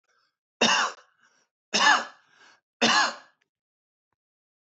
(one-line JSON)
{"three_cough_length": "4.8 s", "three_cough_amplitude": 15457, "three_cough_signal_mean_std_ratio": 0.35, "survey_phase": "beta (2021-08-13 to 2022-03-07)", "age": "45-64", "gender": "Male", "wearing_mask": "No", "symptom_headache": true, "symptom_onset": "5 days", "smoker_status": "Never smoked", "respiratory_condition_asthma": true, "respiratory_condition_other": false, "recruitment_source": "Test and Trace", "submission_delay": "2 days", "covid_test_result": "Positive", "covid_test_method": "RT-qPCR", "covid_ct_value": 27.9, "covid_ct_gene": "N gene"}